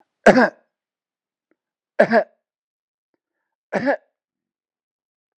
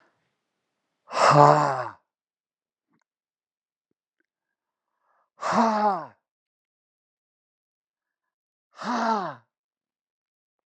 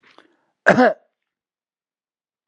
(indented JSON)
{
  "three_cough_length": "5.4 s",
  "three_cough_amplitude": 32768,
  "three_cough_signal_mean_std_ratio": 0.24,
  "exhalation_length": "10.7 s",
  "exhalation_amplitude": 28980,
  "exhalation_signal_mean_std_ratio": 0.28,
  "cough_length": "2.5 s",
  "cough_amplitude": 32768,
  "cough_signal_mean_std_ratio": 0.24,
  "survey_phase": "beta (2021-08-13 to 2022-03-07)",
  "age": "45-64",
  "gender": "Male",
  "wearing_mask": "No",
  "symptom_none": true,
  "smoker_status": "Ex-smoker",
  "respiratory_condition_asthma": false,
  "respiratory_condition_other": false,
  "recruitment_source": "REACT",
  "submission_delay": "5 days",
  "covid_test_result": "Negative",
  "covid_test_method": "RT-qPCR",
  "influenza_a_test_result": "Unknown/Void",
  "influenza_b_test_result": "Unknown/Void"
}